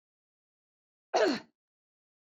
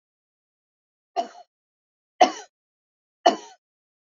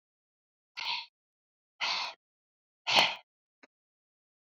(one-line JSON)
{"cough_length": "2.3 s", "cough_amplitude": 6268, "cough_signal_mean_std_ratio": 0.26, "three_cough_length": "4.2 s", "three_cough_amplitude": 26807, "three_cough_signal_mean_std_ratio": 0.18, "exhalation_length": "4.4 s", "exhalation_amplitude": 15153, "exhalation_signal_mean_std_ratio": 0.29, "survey_phase": "beta (2021-08-13 to 2022-03-07)", "age": "45-64", "gender": "Female", "wearing_mask": "Yes", "symptom_none": true, "smoker_status": "Current smoker (e-cigarettes or vapes only)", "respiratory_condition_asthma": false, "respiratory_condition_other": false, "recruitment_source": "REACT", "submission_delay": "6 days", "covid_test_result": "Negative", "covid_test_method": "RT-qPCR"}